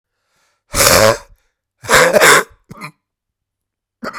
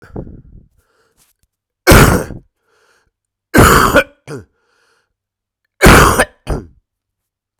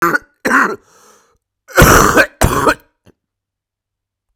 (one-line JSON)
{"exhalation_length": "4.2 s", "exhalation_amplitude": 32768, "exhalation_signal_mean_std_ratio": 0.4, "three_cough_length": "7.6 s", "three_cough_amplitude": 32768, "three_cough_signal_mean_std_ratio": 0.36, "cough_length": "4.4 s", "cough_amplitude": 32768, "cough_signal_mean_std_ratio": 0.43, "survey_phase": "beta (2021-08-13 to 2022-03-07)", "age": "45-64", "gender": "Male", "wearing_mask": "No", "symptom_cough_any": true, "symptom_new_continuous_cough": true, "symptom_runny_or_blocked_nose": true, "symptom_shortness_of_breath": true, "symptom_fatigue": true, "symptom_headache": true, "symptom_change_to_sense_of_smell_or_taste": true, "symptom_loss_of_taste": true, "symptom_onset": "1 day", "smoker_status": "Ex-smoker", "respiratory_condition_asthma": false, "respiratory_condition_other": false, "recruitment_source": "Test and Trace", "submission_delay": "1 day", "covid_test_result": "Positive", "covid_test_method": "LFT"}